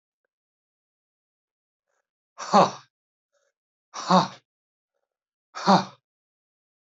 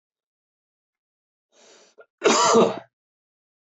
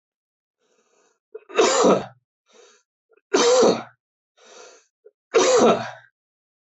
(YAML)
exhalation_length: 6.8 s
exhalation_amplitude: 19438
exhalation_signal_mean_std_ratio: 0.22
cough_length: 3.8 s
cough_amplitude: 18472
cough_signal_mean_std_ratio: 0.3
three_cough_length: 6.7 s
three_cough_amplitude: 17586
three_cough_signal_mean_std_ratio: 0.4
survey_phase: alpha (2021-03-01 to 2021-08-12)
age: 45-64
gender: Male
wearing_mask: 'No'
symptom_cough_any: true
smoker_status: Never smoked
respiratory_condition_asthma: false
respiratory_condition_other: false
recruitment_source: Test and Trace
submission_delay: 1 day
covid_test_result: Positive
covid_test_method: RT-qPCR
covid_ct_value: 16.3
covid_ct_gene: ORF1ab gene
covid_ct_mean: 16.7
covid_viral_load: 3400000 copies/ml
covid_viral_load_category: High viral load (>1M copies/ml)